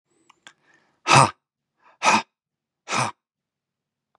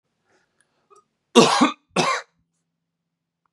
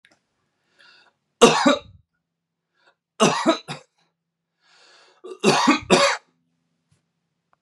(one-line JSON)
{"exhalation_length": "4.2 s", "exhalation_amplitude": 31415, "exhalation_signal_mean_std_ratio": 0.27, "cough_length": "3.5 s", "cough_amplitude": 32767, "cough_signal_mean_std_ratio": 0.29, "three_cough_length": "7.6 s", "three_cough_amplitude": 32767, "three_cough_signal_mean_std_ratio": 0.32, "survey_phase": "beta (2021-08-13 to 2022-03-07)", "age": "18-44", "gender": "Male", "wearing_mask": "No", "symptom_none": true, "symptom_onset": "12 days", "smoker_status": "Current smoker (1 to 10 cigarettes per day)", "respiratory_condition_asthma": false, "respiratory_condition_other": false, "recruitment_source": "REACT", "submission_delay": "1 day", "covid_test_result": "Negative", "covid_test_method": "RT-qPCR", "influenza_a_test_result": "Negative", "influenza_b_test_result": "Negative"}